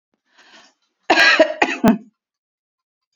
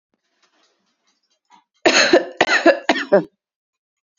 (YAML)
cough_length: 3.2 s
cough_amplitude: 28043
cough_signal_mean_std_ratio: 0.36
three_cough_length: 4.2 s
three_cough_amplitude: 30487
three_cough_signal_mean_std_ratio: 0.36
survey_phase: beta (2021-08-13 to 2022-03-07)
age: 45-64
gender: Female
wearing_mask: 'No'
symptom_fatigue: true
symptom_headache: true
smoker_status: Never smoked
respiratory_condition_asthma: false
respiratory_condition_other: false
recruitment_source: REACT
submission_delay: 1 day
covid_test_result: Negative
covid_test_method: RT-qPCR
influenza_a_test_result: Negative
influenza_b_test_result: Negative